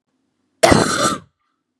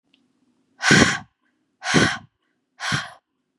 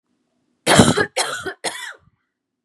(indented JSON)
{
  "cough_length": "1.8 s",
  "cough_amplitude": 32768,
  "cough_signal_mean_std_ratio": 0.41,
  "exhalation_length": "3.6 s",
  "exhalation_amplitude": 32766,
  "exhalation_signal_mean_std_ratio": 0.37,
  "three_cough_length": "2.6 s",
  "three_cough_amplitude": 32768,
  "three_cough_signal_mean_std_ratio": 0.38,
  "survey_phase": "beta (2021-08-13 to 2022-03-07)",
  "age": "18-44",
  "gender": "Female",
  "wearing_mask": "No",
  "symptom_none": true,
  "symptom_onset": "12 days",
  "smoker_status": "Never smoked",
  "respiratory_condition_asthma": false,
  "respiratory_condition_other": false,
  "recruitment_source": "REACT",
  "submission_delay": "2 days",
  "covid_test_result": "Negative",
  "covid_test_method": "RT-qPCR",
  "influenza_a_test_result": "Negative",
  "influenza_b_test_result": "Negative"
}